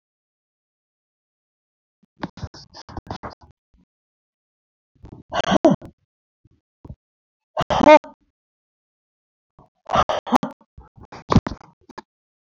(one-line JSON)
{"exhalation_length": "12.4 s", "exhalation_amplitude": 27664, "exhalation_signal_mean_std_ratio": 0.22, "survey_phase": "beta (2021-08-13 to 2022-03-07)", "age": "65+", "gender": "Female", "wearing_mask": "No", "symptom_none": true, "smoker_status": "Ex-smoker", "respiratory_condition_asthma": false, "respiratory_condition_other": false, "recruitment_source": "REACT", "submission_delay": "4 days", "covid_test_result": "Negative", "covid_test_method": "RT-qPCR"}